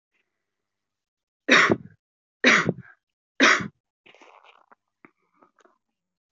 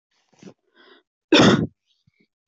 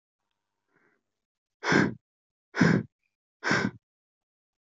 {"three_cough_length": "6.3 s", "three_cough_amplitude": 22942, "three_cough_signal_mean_std_ratio": 0.27, "cough_length": "2.5 s", "cough_amplitude": 23224, "cough_signal_mean_std_ratio": 0.3, "exhalation_length": "4.6 s", "exhalation_amplitude": 11925, "exhalation_signal_mean_std_ratio": 0.31, "survey_phase": "alpha (2021-03-01 to 2021-08-12)", "age": "18-44", "gender": "Female", "wearing_mask": "No", "symptom_none": true, "smoker_status": "Never smoked", "respiratory_condition_asthma": false, "respiratory_condition_other": false, "recruitment_source": "REACT", "submission_delay": "2 days", "covid_test_result": "Negative", "covid_test_method": "RT-qPCR"}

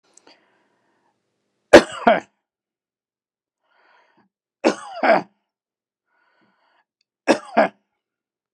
{"three_cough_length": "8.5 s", "three_cough_amplitude": 32768, "three_cough_signal_mean_std_ratio": 0.21, "survey_phase": "beta (2021-08-13 to 2022-03-07)", "age": "65+", "gender": "Male", "wearing_mask": "No", "symptom_none": true, "smoker_status": "Ex-smoker", "respiratory_condition_asthma": false, "respiratory_condition_other": false, "recruitment_source": "REACT", "submission_delay": "3 days", "covid_test_result": "Negative", "covid_test_method": "RT-qPCR"}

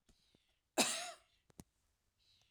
{"cough_length": "2.5 s", "cough_amplitude": 3989, "cough_signal_mean_std_ratio": 0.26, "survey_phase": "alpha (2021-03-01 to 2021-08-12)", "age": "65+", "gender": "Female", "wearing_mask": "No", "symptom_none": true, "smoker_status": "Ex-smoker", "respiratory_condition_asthma": false, "respiratory_condition_other": false, "recruitment_source": "REACT", "submission_delay": "1 day", "covid_test_result": "Negative", "covid_test_method": "RT-qPCR"}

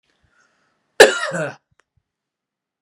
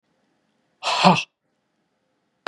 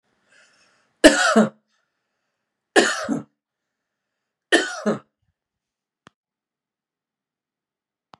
{"cough_length": "2.8 s", "cough_amplitude": 32768, "cough_signal_mean_std_ratio": 0.22, "exhalation_length": "2.5 s", "exhalation_amplitude": 32137, "exhalation_signal_mean_std_ratio": 0.28, "three_cough_length": "8.2 s", "three_cough_amplitude": 32768, "three_cough_signal_mean_std_ratio": 0.25, "survey_phase": "beta (2021-08-13 to 2022-03-07)", "age": "45-64", "gender": "Male", "wearing_mask": "No", "symptom_abdominal_pain": true, "symptom_headache": true, "symptom_onset": "4 days", "smoker_status": "Never smoked", "respiratory_condition_asthma": true, "respiratory_condition_other": false, "recruitment_source": "REACT", "submission_delay": "2 days", "covid_test_result": "Negative", "covid_test_method": "RT-qPCR", "influenza_a_test_result": "Negative", "influenza_b_test_result": "Negative"}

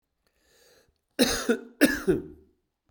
{"cough_length": "2.9 s", "cough_amplitude": 16925, "cough_signal_mean_std_ratio": 0.37, "survey_phase": "beta (2021-08-13 to 2022-03-07)", "age": "45-64", "gender": "Male", "wearing_mask": "No", "symptom_cough_any": true, "symptom_runny_or_blocked_nose": true, "symptom_fatigue": true, "symptom_change_to_sense_of_smell_or_taste": true, "symptom_onset": "7 days", "smoker_status": "Ex-smoker", "respiratory_condition_asthma": false, "respiratory_condition_other": false, "recruitment_source": "Test and Trace", "submission_delay": "1 day", "covid_test_result": "Positive", "covid_test_method": "RT-qPCR", "covid_ct_value": 23.6, "covid_ct_gene": "N gene", "covid_ct_mean": 24.3, "covid_viral_load": "11000 copies/ml", "covid_viral_load_category": "Low viral load (10K-1M copies/ml)"}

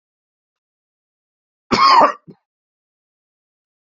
{"cough_length": "3.9 s", "cough_amplitude": 31818, "cough_signal_mean_std_ratio": 0.26, "survey_phase": "beta (2021-08-13 to 2022-03-07)", "age": "45-64", "gender": "Male", "wearing_mask": "No", "symptom_cough_any": true, "symptom_runny_or_blocked_nose": true, "symptom_sore_throat": true, "symptom_abdominal_pain": true, "symptom_diarrhoea": true, "symptom_fatigue": true, "symptom_headache": true, "smoker_status": "Never smoked", "respiratory_condition_asthma": false, "respiratory_condition_other": false, "recruitment_source": "Test and Trace", "submission_delay": "2 days", "covid_test_result": "Positive", "covid_test_method": "RT-qPCR"}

